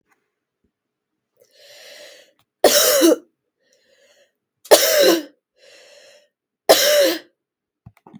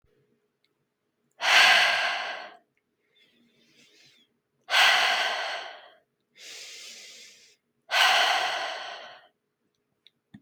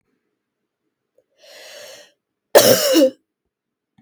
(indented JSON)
{
  "three_cough_length": "8.2 s",
  "three_cough_amplitude": 32768,
  "three_cough_signal_mean_std_ratio": 0.35,
  "exhalation_length": "10.4 s",
  "exhalation_amplitude": 18667,
  "exhalation_signal_mean_std_ratio": 0.41,
  "cough_length": "4.0 s",
  "cough_amplitude": 32768,
  "cough_signal_mean_std_ratio": 0.3,
  "survey_phase": "beta (2021-08-13 to 2022-03-07)",
  "age": "18-44",
  "gender": "Female",
  "wearing_mask": "No",
  "symptom_none": true,
  "smoker_status": "Never smoked",
  "respiratory_condition_asthma": false,
  "respiratory_condition_other": false,
  "recruitment_source": "REACT",
  "submission_delay": "3 days",
  "covid_test_result": "Negative",
  "covid_test_method": "RT-qPCR",
  "influenza_a_test_result": "Negative",
  "influenza_b_test_result": "Negative"
}